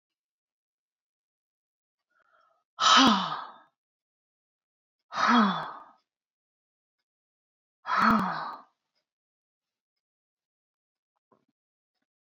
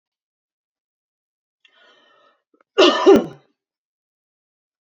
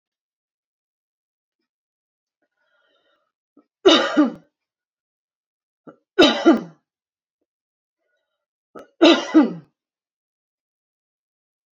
{
  "exhalation_length": "12.3 s",
  "exhalation_amplitude": 13919,
  "exhalation_signal_mean_std_ratio": 0.28,
  "cough_length": "4.9 s",
  "cough_amplitude": 28577,
  "cough_signal_mean_std_ratio": 0.23,
  "three_cough_length": "11.8 s",
  "three_cough_amplitude": 31593,
  "three_cough_signal_mean_std_ratio": 0.24,
  "survey_phase": "beta (2021-08-13 to 2022-03-07)",
  "age": "45-64",
  "gender": "Female",
  "wearing_mask": "No",
  "symptom_runny_or_blocked_nose": true,
  "smoker_status": "Ex-smoker",
  "respiratory_condition_asthma": false,
  "respiratory_condition_other": false,
  "recruitment_source": "REACT",
  "submission_delay": "0 days",
  "covid_test_result": "Negative",
  "covid_test_method": "RT-qPCR"
}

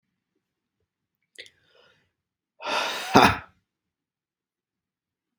{
  "exhalation_length": "5.4 s",
  "exhalation_amplitude": 32719,
  "exhalation_signal_mean_std_ratio": 0.22,
  "survey_phase": "beta (2021-08-13 to 2022-03-07)",
  "age": "18-44",
  "gender": "Male",
  "wearing_mask": "No",
  "symptom_none": true,
  "smoker_status": "Ex-smoker",
  "respiratory_condition_asthma": false,
  "respiratory_condition_other": false,
  "recruitment_source": "REACT",
  "submission_delay": "0 days",
  "covid_test_result": "Negative",
  "covid_test_method": "RT-qPCR",
  "influenza_a_test_result": "Negative",
  "influenza_b_test_result": "Negative"
}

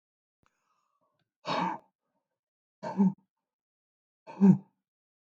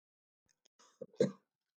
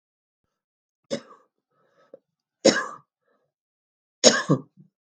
{
  "exhalation_length": "5.3 s",
  "exhalation_amplitude": 9857,
  "exhalation_signal_mean_std_ratio": 0.25,
  "cough_length": "1.8 s",
  "cough_amplitude": 4057,
  "cough_signal_mean_std_ratio": 0.19,
  "three_cough_length": "5.1 s",
  "three_cough_amplitude": 32768,
  "three_cough_signal_mean_std_ratio": 0.22,
  "survey_phase": "beta (2021-08-13 to 2022-03-07)",
  "age": "65+",
  "gender": "Female",
  "wearing_mask": "No",
  "symptom_cough_any": true,
  "symptom_runny_or_blocked_nose": true,
  "symptom_fatigue": true,
  "symptom_onset": "4 days",
  "smoker_status": "Never smoked",
  "respiratory_condition_asthma": false,
  "respiratory_condition_other": false,
  "recruitment_source": "Test and Trace",
  "submission_delay": "2 days",
  "covid_test_result": "Positive",
  "covid_test_method": "ePCR"
}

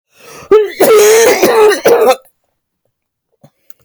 {
  "cough_length": "3.8 s",
  "cough_amplitude": 32768,
  "cough_signal_mean_std_ratio": 0.61,
  "survey_phase": "beta (2021-08-13 to 2022-03-07)",
  "age": "45-64",
  "gender": "Female",
  "wearing_mask": "No",
  "symptom_runny_or_blocked_nose": true,
  "smoker_status": "Never smoked",
  "respiratory_condition_asthma": true,
  "respiratory_condition_other": false,
  "recruitment_source": "REACT",
  "submission_delay": "3 days",
  "covid_test_result": "Negative",
  "covid_test_method": "RT-qPCR",
  "influenza_a_test_result": "Negative",
  "influenza_b_test_result": "Negative"
}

